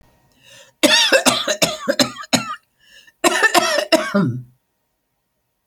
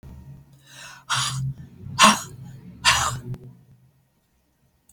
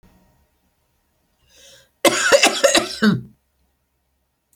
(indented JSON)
{
  "cough_length": "5.7 s",
  "cough_amplitude": 32768,
  "cough_signal_mean_std_ratio": 0.49,
  "exhalation_length": "4.9 s",
  "exhalation_amplitude": 32767,
  "exhalation_signal_mean_std_ratio": 0.38,
  "three_cough_length": "4.6 s",
  "three_cough_amplitude": 32490,
  "three_cough_signal_mean_std_ratio": 0.35,
  "survey_phase": "alpha (2021-03-01 to 2021-08-12)",
  "age": "65+",
  "gender": "Female",
  "wearing_mask": "No",
  "symptom_none": true,
  "smoker_status": "Ex-smoker",
  "respiratory_condition_asthma": false,
  "respiratory_condition_other": false,
  "recruitment_source": "REACT",
  "submission_delay": "4 days",
  "covid_test_result": "Negative",
  "covid_test_method": "RT-qPCR"
}